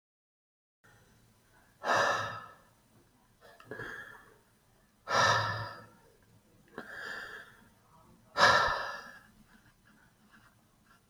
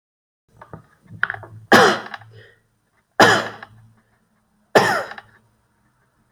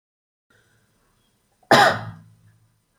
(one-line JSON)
{"exhalation_length": "11.1 s", "exhalation_amplitude": 10751, "exhalation_signal_mean_std_ratio": 0.35, "three_cough_length": "6.3 s", "three_cough_amplitude": 31726, "three_cough_signal_mean_std_ratio": 0.3, "cough_length": "3.0 s", "cough_amplitude": 28418, "cough_signal_mean_std_ratio": 0.25, "survey_phase": "beta (2021-08-13 to 2022-03-07)", "age": "45-64", "gender": "Male", "wearing_mask": "No", "symptom_none": true, "smoker_status": "Never smoked", "respiratory_condition_asthma": true, "respiratory_condition_other": false, "recruitment_source": "REACT", "submission_delay": "2 days", "covid_test_result": "Negative", "covid_test_method": "RT-qPCR"}